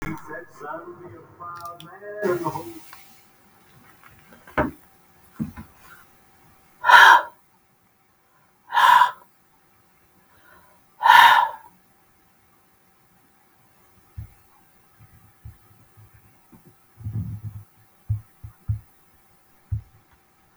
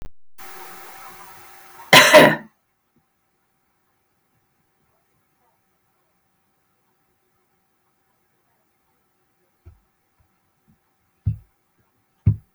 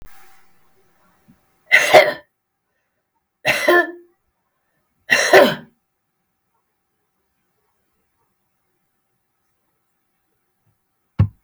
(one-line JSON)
{"exhalation_length": "20.6 s", "exhalation_amplitude": 32768, "exhalation_signal_mean_std_ratio": 0.27, "cough_length": "12.5 s", "cough_amplitude": 32768, "cough_signal_mean_std_ratio": 0.19, "three_cough_length": "11.4 s", "three_cough_amplitude": 32768, "three_cough_signal_mean_std_ratio": 0.25, "survey_phase": "beta (2021-08-13 to 2022-03-07)", "age": "65+", "gender": "Female", "wearing_mask": "No", "symptom_none": true, "smoker_status": "Ex-smoker", "respiratory_condition_asthma": false, "respiratory_condition_other": false, "recruitment_source": "REACT", "submission_delay": "2 days", "covid_test_result": "Negative", "covid_test_method": "RT-qPCR", "influenza_a_test_result": "Negative", "influenza_b_test_result": "Negative"}